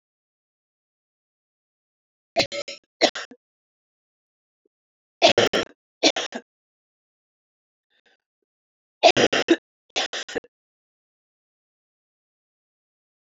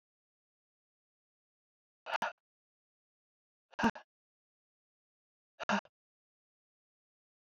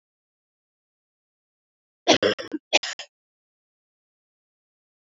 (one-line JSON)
{"three_cough_length": "13.2 s", "three_cough_amplitude": 26800, "three_cough_signal_mean_std_ratio": 0.23, "exhalation_length": "7.4 s", "exhalation_amplitude": 4871, "exhalation_signal_mean_std_ratio": 0.17, "cough_length": "5.0 s", "cough_amplitude": 24332, "cough_signal_mean_std_ratio": 0.2, "survey_phase": "beta (2021-08-13 to 2022-03-07)", "age": "45-64", "gender": "Female", "wearing_mask": "No", "symptom_cough_any": true, "symptom_new_continuous_cough": true, "symptom_runny_or_blocked_nose": true, "symptom_shortness_of_breath": true, "symptom_fatigue": true, "symptom_fever_high_temperature": true, "symptom_headache": true, "symptom_onset": "2 days", "smoker_status": "Never smoked", "respiratory_condition_asthma": false, "respiratory_condition_other": false, "recruitment_source": "Test and Trace", "submission_delay": "2 days", "covid_test_result": "Positive", "covid_test_method": "RT-qPCR", "covid_ct_value": 27.0, "covid_ct_gene": "ORF1ab gene", "covid_ct_mean": 27.3, "covid_viral_load": "1100 copies/ml", "covid_viral_load_category": "Minimal viral load (< 10K copies/ml)"}